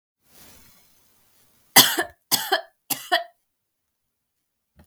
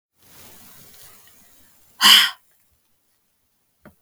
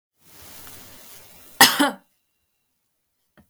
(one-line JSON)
{"three_cough_length": "4.9 s", "three_cough_amplitude": 32768, "three_cough_signal_mean_std_ratio": 0.25, "exhalation_length": "4.0 s", "exhalation_amplitude": 32768, "exhalation_signal_mean_std_ratio": 0.23, "cough_length": "3.5 s", "cough_amplitude": 32768, "cough_signal_mean_std_ratio": 0.23, "survey_phase": "beta (2021-08-13 to 2022-03-07)", "age": "18-44", "gender": "Female", "wearing_mask": "No", "symptom_cough_any": true, "symptom_runny_or_blocked_nose": true, "symptom_sore_throat": true, "symptom_onset": "4 days", "smoker_status": "Ex-smoker", "respiratory_condition_asthma": false, "respiratory_condition_other": false, "recruitment_source": "Test and Trace", "submission_delay": "3 days", "covid_test_result": "Positive", "covid_test_method": "RT-qPCR", "covid_ct_value": 26.9, "covid_ct_gene": "ORF1ab gene", "covid_ct_mean": 27.4, "covid_viral_load": "1000 copies/ml", "covid_viral_load_category": "Minimal viral load (< 10K copies/ml)"}